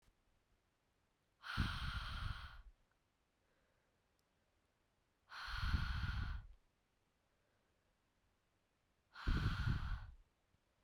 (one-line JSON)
{"exhalation_length": "10.8 s", "exhalation_amplitude": 1798, "exhalation_signal_mean_std_ratio": 0.42, "survey_phase": "beta (2021-08-13 to 2022-03-07)", "age": "18-44", "gender": "Female", "wearing_mask": "No", "symptom_cough_any": true, "symptom_runny_or_blocked_nose": true, "symptom_shortness_of_breath": true, "symptom_headache": true, "symptom_change_to_sense_of_smell_or_taste": true, "symptom_loss_of_taste": true, "symptom_other": true, "symptom_onset": "6 days", "smoker_status": "Never smoked", "respiratory_condition_asthma": false, "respiratory_condition_other": false, "recruitment_source": "Test and Trace", "submission_delay": "2 days", "covid_test_result": "Positive", "covid_test_method": "RT-qPCR", "covid_ct_value": 17.2, "covid_ct_gene": "ORF1ab gene"}